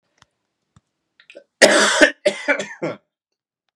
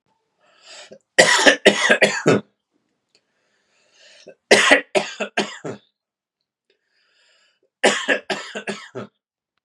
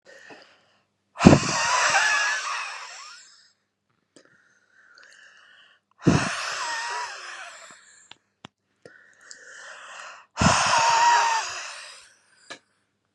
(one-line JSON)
{"cough_length": "3.8 s", "cough_amplitude": 32768, "cough_signal_mean_std_ratio": 0.34, "three_cough_length": "9.6 s", "three_cough_amplitude": 32768, "three_cough_signal_mean_std_ratio": 0.35, "exhalation_length": "13.1 s", "exhalation_amplitude": 32768, "exhalation_signal_mean_std_ratio": 0.41, "survey_phase": "beta (2021-08-13 to 2022-03-07)", "age": "18-44", "gender": "Male", "wearing_mask": "No", "symptom_runny_or_blocked_nose": true, "symptom_headache": true, "smoker_status": "Never smoked", "respiratory_condition_asthma": false, "respiratory_condition_other": false, "recruitment_source": "Test and Trace", "submission_delay": "2 days", "covid_test_result": "Positive", "covid_test_method": "RT-qPCR", "covid_ct_value": 26.9, "covid_ct_gene": "ORF1ab gene"}